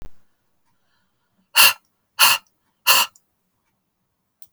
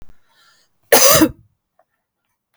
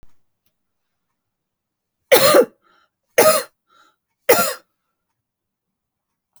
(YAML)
exhalation_length: 4.5 s
exhalation_amplitude: 32768
exhalation_signal_mean_std_ratio: 0.28
cough_length: 2.6 s
cough_amplitude: 32768
cough_signal_mean_std_ratio: 0.32
three_cough_length: 6.4 s
three_cough_amplitude: 32768
three_cough_signal_mean_std_ratio: 0.28
survey_phase: beta (2021-08-13 to 2022-03-07)
age: 18-44
gender: Female
wearing_mask: 'No'
symptom_none: true
smoker_status: Never smoked
respiratory_condition_asthma: false
respiratory_condition_other: false
recruitment_source: REACT
submission_delay: 1 day
covid_test_result: Negative
covid_test_method: RT-qPCR